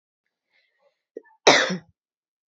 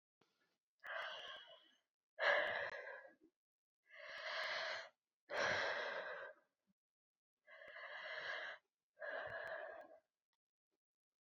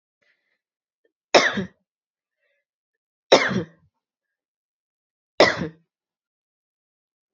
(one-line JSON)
{"cough_length": "2.5 s", "cough_amplitude": 28435, "cough_signal_mean_std_ratio": 0.24, "exhalation_length": "11.3 s", "exhalation_amplitude": 2112, "exhalation_signal_mean_std_ratio": 0.5, "three_cough_length": "7.3 s", "three_cough_amplitude": 32768, "three_cough_signal_mean_std_ratio": 0.22, "survey_phase": "beta (2021-08-13 to 2022-03-07)", "age": "18-44", "gender": "Female", "wearing_mask": "No", "symptom_runny_or_blocked_nose": true, "symptom_abdominal_pain": true, "symptom_fatigue": true, "symptom_fever_high_temperature": true, "symptom_headache": true, "symptom_change_to_sense_of_smell_or_taste": true, "symptom_loss_of_taste": true, "smoker_status": "Never smoked", "respiratory_condition_asthma": false, "respiratory_condition_other": false, "recruitment_source": "Test and Trace", "submission_delay": "2 days", "covid_test_result": "Positive", "covid_test_method": "RT-qPCR"}